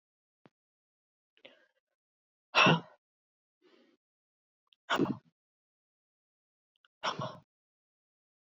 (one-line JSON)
{"exhalation_length": "8.4 s", "exhalation_amplitude": 10017, "exhalation_signal_mean_std_ratio": 0.2, "survey_phase": "beta (2021-08-13 to 2022-03-07)", "age": "18-44", "gender": "Female", "wearing_mask": "No", "symptom_cough_any": true, "symptom_runny_or_blocked_nose": true, "symptom_sore_throat": true, "symptom_fever_high_temperature": true, "symptom_headache": true, "symptom_onset": "4 days", "smoker_status": "Never smoked", "respiratory_condition_asthma": false, "respiratory_condition_other": false, "recruitment_source": "Test and Trace", "submission_delay": "2 days", "covid_test_result": "Positive", "covid_test_method": "RT-qPCR", "covid_ct_value": 30.0, "covid_ct_gene": "ORF1ab gene"}